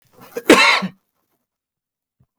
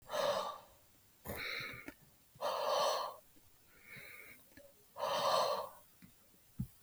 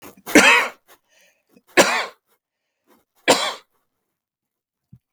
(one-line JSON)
{"cough_length": "2.4 s", "cough_amplitude": 32768, "cough_signal_mean_std_ratio": 0.31, "exhalation_length": "6.8 s", "exhalation_amplitude": 3081, "exhalation_signal_mean_std_ratio": 0.55, "three_cough_length": "5.1 s", "three_cough_amplitude": 32768, "three_cough_signal_mean_std_ratio": 0.3, "survey_phase": "beta (2021-08-13 to 2022-03-07)", "age": "45-64", "gender": "Male", "wearing_mask": "No", "symptom_none": true, "smoker_status": "Prefer not to say", "respiratory_condition_asthma": false, "respiratory_condition_other": false, "recruitment_source": "REACT", "submission_delay": "18 days", "covid_test_result": "Negative", "covid_test_method": "RT-qPCR", "influenza_a_test_result": "Negative", "influenza_b_test_result": "Negative"}